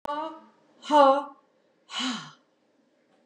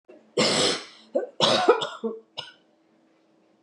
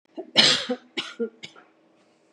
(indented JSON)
{
  "exhalation_length": "3.3 s",
  "exhalation_amplitude": 18583,
  "exhalation_signal_mean_std_ratio": 0.35,
  "cough_length": "3.6 s",
  "cough_amplitude": 19626,
  "cough_signal_mean_std_ratio": 0.46,
  "three_cough_length": "2.3 s",
  "three_cough_amplitude": 26720,
  "three_cough_signal_mean_std_ratio": 0.36,
  "survey_phase": "beta (2021-08-13 to 2022-03-07)",
  "age": "65+",
  "gender": "Female",
  "wearing_mask": "No",
  "symptom_none": true,
  "smoker_status": "Never smoked",
  "respiratory_condition_asthma": true,
  "respiratory_condition_other": false,
  "recruitment_source": "REACT",
  "submission_delay": "2 days",
  "covid_test_result": "Negative",
  "covid_test_method": "RT-qPCR",
  "covid_ct_value": 39.0,
  "covid_ct_gene": "N gene",
  "influenza_a_test_result": "Negative",
  "influenza_b_test_result": "Negative"
}